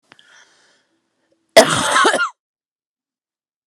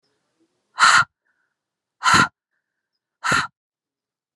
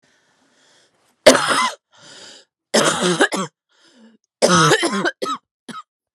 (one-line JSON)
{"cough_length": "3.7 s", "cough_amplitude": 32768, "cough_signal_mean_std_ratio": 0.31, "exhalation_length": "4.4 s", "exhalation_amplitude": 29778, "exhalation_signal_mean_std_ratio": 0.31, "three_cough_length": "6.1 s", "three_cough_amplitude": 32768, "three_cough_signal_mean_std_ratio": 0.43, "survey_phase": "alpha (2021-03-01 to 2021-08-12)", "age": "18-44", "gender": "Female", "wearing_mask": "No", "symptom_cough_any": true, "symptom_shortness_of_breath": true, "symptom_abdominal_pain": true, "symptom_diarrhoea": true, "symptom_fatigue": true, "symptom_fever_high_temperature": true, "symptom_headache": true, "symptom_change_to_sense_of_smell_or_taste": true, "symptom_loss_of_taste": true, "symptom_onset": "9 days", "smoker_status": "Current smoker (1 to 10 cigarettes per day)", "respiratory_condition_asthma": false, "respiratory_condition_other": false, "recruitment_source": "Test and Trace", "submission_delay": "2 days", "covid_test_result": "Positive", "covid_test_method": "RT-qPCR", "covid_ct_value": 20.1, "covid_ct_gene": "ORF1ab gene", "covid_ct_mean": 20.8, "covid_viral_load": "150000 copies/ml", "covid_viral_load_category": "Low viral load (10K-1M copies/ml)"}